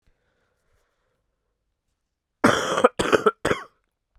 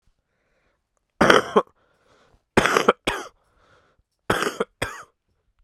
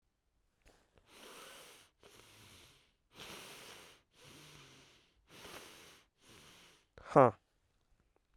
{"cough_length": "4.2 s", "cough_amplitude": 32768, "cough_signal_mean_std_ratio": 0.29, "three_cough_length": "5.6 s", "three_cough_amplitude": 32768, "three_cough_signal_mean_std_ratio": 0.3, "exhalation_length": "8.4 s", "exhalation_amplitude": 8892, "exhalation_signal_mean_std_ratio": 0.17, "survey_phase": "beta (2021-08-13 to 2022-03-07)", "age": "18-44", "gender": "Male", "wearing_mask": "Yes", "symptom_cough_any": true, "symptom_runny_or_blocked_nose": true, "symptom_abdominal_pain": true, "smoker_status": "Never smoked", "respiratory_condition_asthma": false, "respiratory_condition_other": false, "recruitment_source": "Test and Trace", "submission_delay": "0 days", "covid_test_result": "Positive", "covid_test_method": "LFT"}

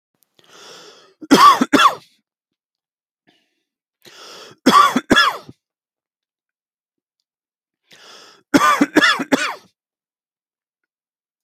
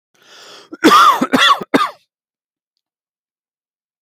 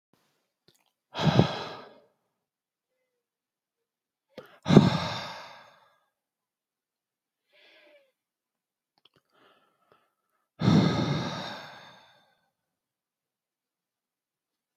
{"three_cough_length": "11.4 s", "three_cough_amplitude": 31605, "three_cough_signal_mean_std_ratio": 0.31, "cough_length": "4.0 s", "cough_amplitude": 32051, "cough_signal_mean_std_ratio": 0.38, "exhalation_length": "14.8 s", "exhalation_amplitude": 26618, "exhalation_signal_mean_std_ratio": 0.24, "survey_phase": "beta (2021-08-13 to 2022-03-07)", "age": "45-64", "gender": "Male", "wearing_mask": "No", "symptom_none": true, "smoker_status": "Never smoked", "respiratory_condition_asthma": false, "respiratory_condition_other": false, "recruitment_source": "REACT", "submission_delay": "1 day", "covid_test_result": "Negative", "covid_test_method": "RT-qPCR"}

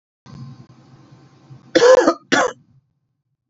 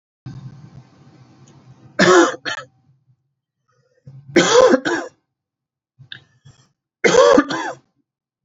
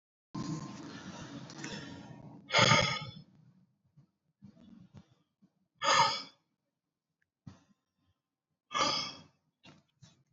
{"cough_length": "3.5 s", "cough_amplitude": 30527, "cough_signal_mean_std_ratio": 0.33, "three_cough_length": "8.4 s", "three_cough_amplitude": 32768, "three_cough_signal_mean_std_ratio": 0.35, "exhalation_length": "10.3 s", "exhalation_amplitude": 10153, "exhalation_signal_mean_std_ratio": 0.34, "survey_phase": "beta (2021-08-13 to 2022-03-07)", "age": "18-44", "gender": "Male", "wearing_mask": "No", "symptom_fatigue": true, "symptom_headache": true, "smoker_status": "Never smoked", "respiratory_condition_asthma": true, "respiratory_condition_other": false, "recruitment_source": "REACT", "submission_delay": "1 day", "covid_test_result": "Negative", "covid_test_method": "RT-qPCR", "influenza_a_test_result": "Unknown/Void", "influenza_b_test_result": "Unknown/Void"}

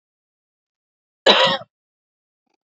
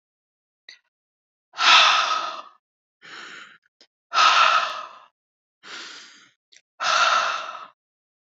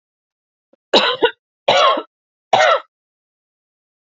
{"cough_length": "2.7 s", "cough_amplitude": 29382, "cough_signal_mean_std_ratio": 0.26, "exhalation_length": "8.4 s", "exhalation_amplitude": 26796, "exhalation_signal_mean_std_ratio": 0.4, "three_cough_length": "4.1 s", "three_cough_amplitude": 30289, "three_cough_signal_mean_std_ratio": 0.38, "survey_phase": "beta (2021-08-13 to 2022-03-07)", "age": "18-44", "gender": "Female", "wearing_mask": "No", "symptom_fatigue": true, "symptom_headache": true, "symptom_onset": "12 days", "smoker_status": "Never smoked", "respiratory_condition_asthma": true, "respiratory_condition_other": false, "recruitment_source": "REACT", "submission_delay": "3 days", "covid_test_result": "Negative", "covid_test_method": "RT-qPCR"}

